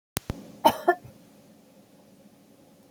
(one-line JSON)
{"cough_length": "2.9 s", "cough_amplitude": 32768, "cough_signal_mean_std_ratio": 0.24, "survey_phase": "beta (2021-08-13 to 2022-03-07)", "age": "65+", "gender": "Female", "wearing_mask": "No", "symptom_none": true, "smoker_status": "Ex-smoker", "respiratory_condition_asthma": false, "respiratory_condition_other": false, "recruitment_source": "REACT", "submission_delay": "3 days", "covid_test_result": "Negative", "covid_test_method": "RT-qPCR", "influenza_a_test_result": "Negative", "influenza_b_test_result": "Negative"}